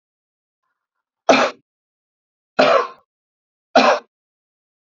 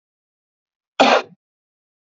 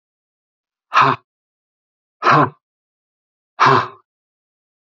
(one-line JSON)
{"three_cough_length": "4.9 s", "three_cough_amplitude": 28247, "three_cough_signal_mean_std_ratio": 0.3, "cough_length": "2.0 s", "cough_amplitude": 31256, "cough_signal_mean_std_ratio": 0.26, "exhalation_length": "4.9 s", "exhalation_amplitude": 28741, "exhalation_signal_mean_std_ratio": 0.31, "survey_phase": "beta (2021-08-13 to 2022-03-07)", "age": "45-64", "gender": "Male", "wearing_mask": "No", "symptom_none": true, "smoker_status": "Ex-smoker", "respiratory_condition_asthma": false, "respiratory_condition_other": false, "recruitment_source": "REACT", "submission_delay": "0 days", "covid_test_result": "Negative", "covid_test_method": "RT-qPCR", "influenza_a_test_result": "Unknown/Void", "influenza_b_test_result": "Unknown/Void"}